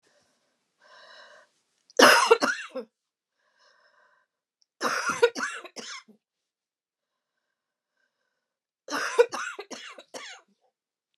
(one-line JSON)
{"three_cough_length": "11.2 s", "three_cough_amplitude": 26270, "three_cough_signal_mean_std_ratio": 0.26, "survey_phase": "beta (2021-08-13 to 2022-03-07)", "age": "65+", "gender": "Female", "wearing_mask": "No", "symptom_abdominal_pain": true, "symptom_onset": "11 days", "smoker_status": "Never smoked", "respiratory_condition_asthma": true, "respiratory_condition_other": true, "recruitment_source": "REACT", "submission_delay": "2 days", "covid_test_result": "Negative", "covid_test_method": "RT-qPCR", "influenza_a_test_result": "Negative", "influenza_b_test_result": "Negative"}